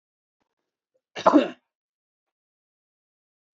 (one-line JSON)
{"cough_length": "3.6 s", "cough_amplitude": 24505, "cough_signal_mean_std_ratio": 0.18, "survey_phase": "beta (2021-08-13 to 2022-03-07)", "age": "18-44", "gender": "Male", "wearing_mask": "No", "symptom_sore_throat": true, "symptom_onset": "2 days", "smoker_status": "Never smoked", "respiratory_condition_asthma": false, "respiratory_condition_other": false, "recruitment_source": "REACT", "submission_delay": "1 day", "covid_test_result": "Negative", "covid_test_method": "RT-qPCR"}